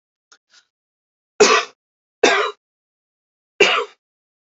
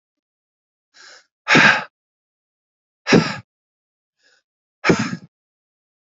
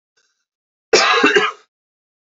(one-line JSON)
{"three_cough_length": "4.4 s", "three_cough_amplitude": 29119, "three_cough_signal_mean_std_ratio": 0.31, "exhalation_length": "6.1 s", "exhalation_amplitude": 29120, "exhalation_signal_mean_std_ratio": 0.27, "cough_length": "2.3 s", "cough_amplitude": 32768, "cough_signal_mean_std_ratio": 0.41, "survey_phase": "beta (2021-08-13 to 2022-03-07)", "age": "18-44", "gender": "Male", "wearing_mask": "No", "symptom_cough_any": true, "symptom_new_continuous_cough": true, "symptom_runny_or_blocked_nose": true, "symptom_shortness_of_breath": true, "symptom_sore_throat": true, "symptom_diarrhoea": true, "symptom_fatigue": true, "symptom_fever_high_temperature": true, "symptom_headache": true, "symptom_change_to_sense_of_smell_or_taste": true, "symptom_loss_of_taste": true, "symptom_onset": "2 days", "smoker_status": "Never smoked", "respiratory_condition_asthma": false, "respiratory_condition_other": false, "recruitment_source": "Test and Trace", "submission_delay": "2 days", "covid_test_result": "Positive", "covid_test_method": "RT-qPCR", "covid_ct_value": 26.6, "covid_ct_gene": "ORF1ab gene", "covid_ct_mean": 27.1, "covid_viral_load": "1300 copies/ml", "covid_viral_load_category": "Minimal viral load (< 10K copies/ml)"}